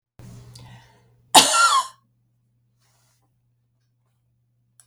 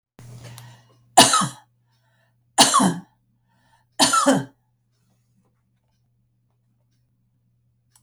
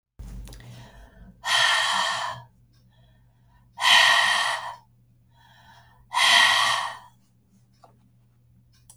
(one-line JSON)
{"cough_length": "4.9 s", "cough_amplitude": 32768, "cough_signal_mean_std_ratio": 0.25, "three_cough_length": "8.0 s", "three_cough_amplitude": 32768, "three_cough_signal_mean_std_ratio": 0.29, "exhalation_length": "9.0 s", "exhalation_amplitude": 23620, "exhalation_signal_mean_std_ratio": 0.45, "survey_phase": "beta (2021-08-13 to 2022-03-07)", "age": "65+", "gender": "Female", "wearing_mask": "No", "symptom_runny_or_blocked_nose": true, "symptom_sore_throat": true, "smoker_status": "Ex-smoker", "respiratory_condition_asthma": false, "respiratory_condition_other": false, "recruitment_source": "REACT", "submission_delay": "2 days", "covid_test_result": "Negative", "covid_test_method": "RT-qPCR", "influenza_a_test_result": "Negative", "influenza_b_test_result": "Negative"}